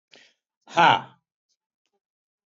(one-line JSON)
{"cough_length": "2.6 s", "cough_amplitude": 19533, "cough_signal_mean_std_ratio": 0.23, "survey_phase": "beta (2021-08-13 to 2022-03-07)", "age": "45-64", "gender": "Male", "wearing_mask": "No", "symptom_none": true, "smoker_status": "Current smoker (1 to 10 cigarettes per day)", "respiratory_condition_asthma": false, "respiratory_condition_other": false, "recruitment_source": "REACT", "submission_delay": "1 day", "covid_test_result": "Negative", "covid_test_method": "RT-qPCR", "influenza_a_test_result": "Negative", "influenza_b_test_result": "Negative"}